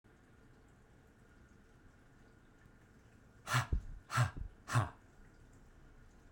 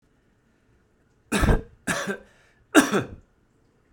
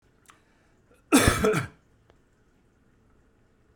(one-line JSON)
{"exhalation_length": "6.3 s", "exhalation_amplitude": 3555, "exhalation_signal_mean_std_ratio": 0.35, "three_cough_length": "3.9 s", "three_cough_amplitude": 28546, "three_cough_signal_mean_std_ratio": 0.33, "cough_length": "3.8 s", "cough_amplitude": 19577, "cough_signal_mean_std_ratio": 0.29, "survey_phase": "beta (2021-08-13 to 2022-03-07)", "age": "45-64", "gender": "Male", "wearing_mask": "No", "symptom_runny_or_blocked_nose": true, "symptom_shortness_of_breath": true, "symptom_onset": "12 days", "smoker_status": "Ex-smoker", "respiratory_condition_asthma": false, "respiratory_condition_other": false, "recruitment_source": "REACT", "submission_delay": "1 day", "covid_test_result": "Negative", "covid_test_method": "RT-qPCR", "influenza_a_test_result": "Negative", "influenza_b_test_result": "Negative"}